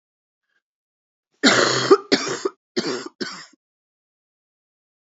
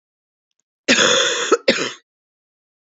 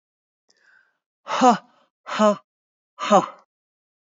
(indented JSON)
{
  "three_cough_length": "5.0 s",
  "three_cough_amplitude": 27727,
  "three_cough_signal_mean_std_ratio": 0.33,
  "cough_length": "2.9 s",
  "cough_amplitude": 28689,
  "cough_signal_mean_std_ratio": 0.43,
  "exhalation_length": "4.1 s",
  "exhalation_amplitude": 27874,
  "exhalation_signal_mean_std_ratio": 0.3,
  "survey_phase": "beta (2021-08-13 to 2022-03-07)",
  "age": "45-64",
  "gender": "Female",
  "wearing_mask": "No",
  "symptom_cough_any": true,
  "symptom_runny_or_blocked_nose": true,
  "symptom_sore_throat": true,
  "symptom_fatigue": true,
  "symptom_onset": "3 days",
  "smoker_status": "Ex-smoker",
  "respiratory_condition_asthma": false,
  "respiratory_condition_other": false,
  "recruitment_source": "Test and Trace",
  "submission_delay": "2 days",
  "covid_test_result": "Positive",
  "covid_test_method": "RT-qPCR",
  "covid_ct_value": 18.0,
  "covid_ct_gene": "N gene"
}